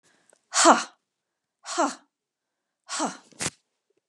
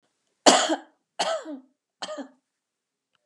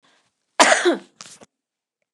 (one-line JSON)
{"exhalation_length": "4.1 s", "exhalation_amplitude": 29253, "exhalation_signal_mean_std_ratio": 0.28, "three_cough_length": "3.3 s", "three_cough_amplitude": 31090, "three_cough_signal_mean_std_ratio": 0.31, "cough_length": "2.1 s", "cough_amplitude": 32768, "cough_signal_mean_std_ratio": 0.32, "survey_phase": "beta (2021-08-13 to 2022-03-07)", "age": "65+", "gender": "Female", "wearing_mask": "No", "symptom_none": true, "smoker_status": "Never smoked", "respiratory_condition_asthma": false, "respiratory_condition_other": false, "recruitment_source": "REACT", "submission_delay": "3 days", "covid_test_result": "Negative", "covid_test_method": "RT-qPCR"}